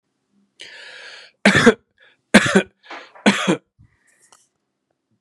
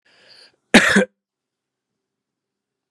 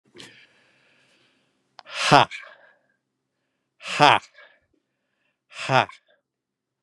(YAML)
three_cough_length: 5.2 s
three_cough_amplitude: 32768
three_cough_signal_mean_std_ratio: 0.3
cough_length: 2.9 s
cough_amplitude: 32768
cough_signal_mean_std_ratio: 0.24
exhalation_length: 6.8 s
exhalation_amplitude: 32767
exhalation_signal_mean_std_ratio: 0.22
survey_phase: beta (2021-08-13 to 2022-03-07)
age: 65+
gender: Male
wearing_mask: 'No'
symptom_none: true
smoker_status: Never smoked
respiratory_condition_asthma: false
respiratory_condition_other: false
recruitment_source: REACT
submission_delay: 2 days
covid_test_result: Negative
covid_test_method: RT-qPCR
influenza_a_test_result: Negative
influenza_b_test_result: Negative